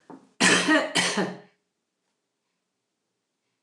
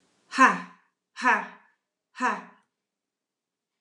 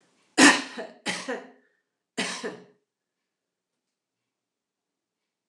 {"cough_length": "3.6 s", "cough_amplitude": 21001, "cough_signal_mean_std_ratio": 0.38, "exhalation_length": "3.8 s", "exhalation_amplitude": 21780, "exhalation_signal_mean_std_ratio": 0.29, "three_cough_length": "5.5 s", "three_cough_amplitude": 24572, "three_cough_signal_mean_std_ratio": 0.23, "survey_phase": "alpha (2021-03-01 to 2021-08-12)", "age": "65+", "gender": "Female", "wearing_mask": "No", "symptom_none": true, "smoker_status": "Ex-smoker", "respiratory_condition_asthma": false, "respiratory_condition_other": false, "recruitment_source": "REACT", "submission_delay": "3 days", "covid_test_result": "Negative", "covid_test_method": "RT-qPCR"}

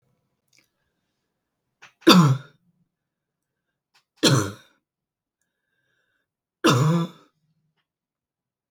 {"three_cough_length": "8.7 s", "three_cough_amplitude": 32768, "three_cough_signal_mean_std_ratio": 0.26, "survey_phase": "beta (2021-08-13 to 2022-03-07)", "age": "45-64", "gender": "Female", "wearing_mask": "No", "symptom_none": true, "smoker_status": "Never smoked", "respiratory_condition_asthma": false, "respiratory_condition_other": false, "recruitment_source": "REACT", "submission_delay": "1 day", "covid_test_result": "Negative", "covid_test_method": "RT-qPCR", "influenza_a_test_result": "Negative", "influenza_b_test_result": "Negative"}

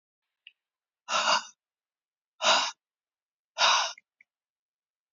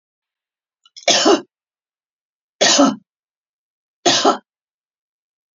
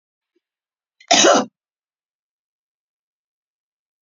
{"exhalation_length": "5.1 s", "exhalation_amplitude": 12617, "exhalation_signal_mean_std_ratio": 0.33, "three_cough_length": "5.5 s", "three_cough_amplitude": 32767, "three_cough_signal_mean_std_ratio": 0.33, "cough_length": "4.0 s", "cough_amplitude": 32768, "cough_signal_mean_std_ratio": 0.23, "survey_phase": "beta (2021-08-13 to 2022-03-07)", "age": "65+", "gender": "Female", "wearing_mask": "No", "symptom_none": true, "smoker_status": "Ex-smoker", "respiratory_condition_asthma": false, "respiratory_condition_other": false, "recruitment_source": "REACT", "submission_delay": "2 days", "covid_test_result": "Negative", "covid_test_method": "RT-qPCR", "influenza_a_test_result": "Unknown/Void", "influenza_b_test_result": "Unknown/Void"}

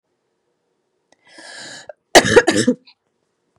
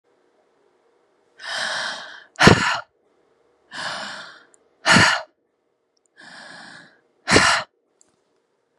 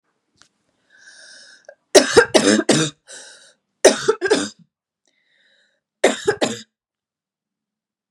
{"cough_length": "3.6 s", "cough_amplitude": 32768, "cough_signal_mean_std_ratio": 0.27, "exhalation_length": "8.8 s", "exhalation_amplitude": 32768, "exhalation_signal_mean_std_ratio": 0.33, "three_cough_length": "8.1 s", "three_cough_amplitude": 32768, "three_cough_signal_mean_std_ratio": 0.31, "survey_phase": "beta (2021-08-13 to 2022-03-07)", "age": "18-44", "gender": "Female", "wearing_mask": "No", "symptom_cough_any": true, "symptom_runny_or_blocked_nose": true, "symptom_shortness_of_breath": true, "symptom_sore_throat": true, "symptom_headache": true, "symptom_onset": "3 days", "smoker_status": "Never smoked", "respiratory_condition_asthma": false, "respiratory_condition_other": false, "recruitment_source": "Test and Trace", "submission_delay": "1 day", "covid_test_result": "Positive", "covid_test_method": "RT-qPCR", "covid_ct_value": 22.7, "covid_ct_gene": "N gene"}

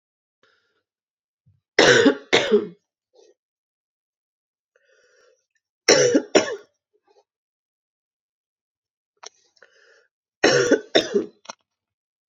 {"three_cough_length": "12.3 s", "three_cough_amplitude": 31601, "three_cough_signal_mean_std_ratio": 0.29, "survey_phase": "beta (2021-08-13 to 2022-03-07)", "age": "18-44", "gender": "Female", "wearing_mask": "No", "symptom_sore_throat": true, "symptom_onset": "3 days", "smoker_status": "Never smoked", "respiratory_condition_asthma": false, "respiratory_condition_other": false, "recruitment_source": "Test and Trace", "submission_delay": "1 day", "covid_test_result": "Negative", "covid_test_method": "ePCR"}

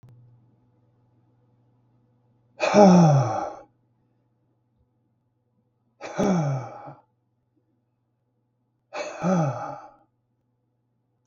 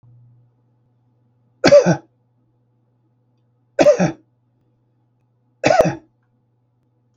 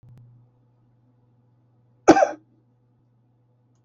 {"exhalation_length": "11.3 s", "exhalation_amplitude": 28394, "exhalation_signal_mean_std_ratio": 0.31, "three_cough_length": "7.2 s", "three_cough_amplitude": 32768, "three_cough_signal_mean_std_ratio": 0.27, "cough_length": "3.8 s", "cough_amplitude": 32768, "cough_signal_mean_std_ratio": 0.18, "survey_phase": "beta (2021-08-13 to 2022-03-07)", "age": "65+", "gender": "Male", "wearing_mask": "No", "symptom_none": true, "smoker_status": "Never smoked", "respiratory_condition_asthma": true, "respiratory_condition_other": false, "recruitment_source": "REACT", "submission_delay": "2 days", "covid_test_result": "Negative", "covid_test_method": "RT-qPCR", "influenza_a_test_result": "Negative", "influenza_b_test_result": "Negative"}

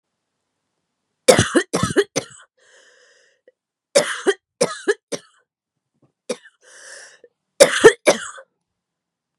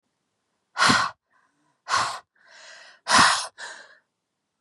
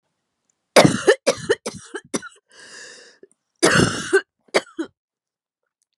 {"three_cough_length": "9.4 s", "three_cough_amplitude": 32768, "three_cough_signal_mean_std_ratio": 0.27, "exhalation_length": "4.6 s", "exhalation_amplitude": 21495, "exhalation_signal_mean_std_ratio": 0.36, "cough_length": "6.0 s", "cough_amplitude": 32767, "cough_signal_mean_std_ratio": 0.33, "survey_phase": "beta (2021-08-13 to 2022-03-07)", "age": "18-44", "gender": "Female", "wearing_mask": "No", "symptom_cough_any": true, "symptom_new_continuous_cough": true, "symptom_runny_or_blocked_nose": true, "symptom_abdominal_pain": true, "symptom_headache": true, "symptom_onset": "4 days", "smoker_status": "Ex-smoker", "respiratory_condition_asthma": false, "respiratory_condition_other": false, "recruitment_source": "Test and Trace", "submission_delay": "1 day", "covid_test_result": "Positive", "covid_test_method": "RT-qPCR", "covid_ct_value": 20.8, "covid_ct_gene": "N gene"}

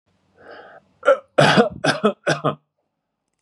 {"three_cough_length": "3.4 s", "three_cough_amplitude": 31317, "three_cough_signal_mean_std_ratio": 0.39, "survey_phase": "beta (2021-08-13 to 2022-03-07)", "age": "65+", "gender": "Male", "wearing_mask": "No", "symptom_none": true, "smoker_status": "Never smoked", "respiratory_condition_asthma": false, "respiratory_condition_other": false, "recruitment_source": "REACT", "submission_delay": "3 days", "covid_test_result": "Negative", "covid_test_method": "RT-qPCR", "influenza_a_test_result": "Negative", "influenza_b_test_result": "Negative"}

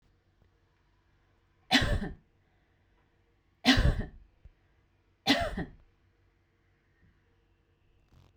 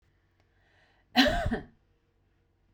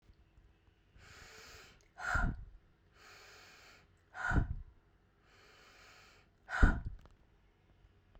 {"three_cough_length": "8.4 s", "three_cough_amplitude": 12635, "three_cough_signal_mean_std_ratio": 0.28, "cough_length": "2.7 s", "cough_amplitude": 12934, "cough_signal_mean_std_ratio": 0.31, "exhalation_length": "8.2 s", "exhalation_amplitude": 8411, "exhalation_signal_mean_std_ratio": 0.3, "survey_phase": "beta (2021-08-13 to 2022-03-07)", "age": "18-44", "gender": "Female", "wearing_mask": "Yes", "symptom_none": true, "smoker_status": "Never smoked", "respiratory_condition_asthma": false, "respiratory_condition_other": false, "recruitment_source": "REACT", "submission_delay": "3 days", "covid_test_result": "Negative", "covid_test_method": "RT-qPCR"}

